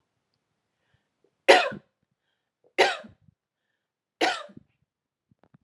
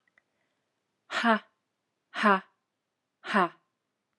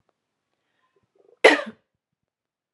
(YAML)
three_cough_length: 5.6 s
three_cough_amplitude: 30835
three_cough_signal_mean_std_ratio: 0.22
exhalation_length: 4.2 s
exhalation_amplitude: 14183
exhalation_signal_mean_std_ratio: 0.29
cough_length: 2.7 s
cough_amplitude: 32767
cough_signal_mean_std_ratio: 0.17
survey_phase: alpha (2021-03-01 to 2021-08-12)
age: 18-44
gender: Female
wearing_mask: 'No'
symptom_fatigue: true
symptom_headache: true
smoker_status: Never smoked
respiratory_condition_asthma: false
respiratory_condition_other: false
recruitment_source: Test and Trace
submission_delay: 2 days
covid_test_result: Positive
covid_test_method: RT-qPCR
covid_ct_value: 18.2
covid_ct_gene: ORF1ab gene
covid_ct_mean: 18.8
covid_viral_load: 690000 copies/ml
covid_viral_load_category: Low viral load (10K-1M copies/ml)